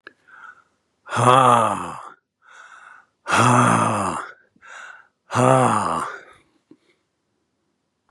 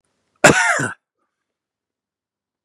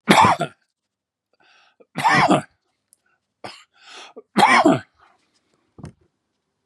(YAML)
exhalation_length: 8.1 s
exhalation_amplitude: 32456
exhalation_signal_mean_std_ratio: 0.44
cough_length: 2.6 s
cough_amplitude: 32768
cough_signal_mean_std_ratio: 0.29
three_cough_length: 6.7 s
three_cough_amplitude: 32768
three_cough_signal_mean_std_ratio: 0.35
survey_phase: beta (2021-08-13 to 2022-03-07)
age: 65+
gender: Male
wearing_mask: 'No'
symptom_none: true
smoker_status: Never smoked
respiratory_condition_asthma: false
respiratory_condition_other: false
recruitment_source: REACT
submission_delay: 1 day
covid_test_result: Negative
covid_test_method: RT-qPCR
influenza_a_test_result: Negative
influenza_b_test_result: Negative